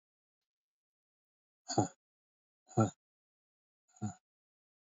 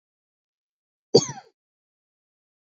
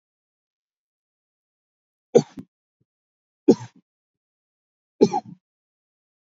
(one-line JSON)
{"exhalation_length": "4.9 s", "exhalation_amplitude": 4611, "exhalation_signal_mean_std_ratio": 0.2, "cough_length": "2.6 s", "cough_amplitude": 26697, "cough_signal_mean_std_ratio": 0.15, "three_cough_length": "6.2 s", "three_cough_amplitude": 26895, "three_cough_signal_mean_std_ratio": 0.15, "survey_phase": "beta (2021-08-13 to 2022-03-07)", "age": "18-44", "gender": "Male", "wearing_mask": "No", "symptom_cough_any": true, "symptom_fatigue": true, "smoker_status": "Never smoked", "respiratory_condition_asthma": false, "respiratory_condition_other": false, "recruitment_source": "REACT", "submission_delay": "5 days", "covid_test_result": "Negative", "covid_test_method": "RT-qPCR", "influenza_a_test_result": "Negative", "influenza_b_test_result": "Negative"}